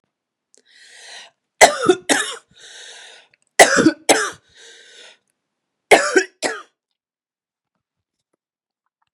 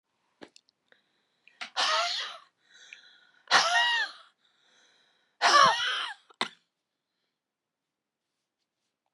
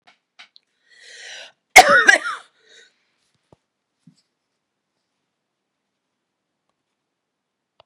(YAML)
three_cough_length: 9.1 s
three_cough_amplitude: 32768
three_cough_signal_mean_std_ratio: 0.28
exhalation_length: 9.1 s
exhalation_amplitude: 15348
exhalation_signal_mean_std_ratio: 0.34
cough_length: 7.9 s
cough_amplitude: 32768
cough_signal_mean_std_ratio: 0.18
survey_phase: beta (2021-08-13 to 2022-03-07)
age: 45-64
gender: Female
wearing_mask: 'No'
symptom_cough_any: true
symptom_onset: 12 days
smoker_status: Never smoked
respiratory_condition_asthma: false
respiratory_condition_other: false
recruitment_source: REACT
submission_delay: 1 day
covid_test_result: Negative
covid_test_method: RT-qPCR
influenza_a_test_result: Negative
influenza_b_test_result: Negative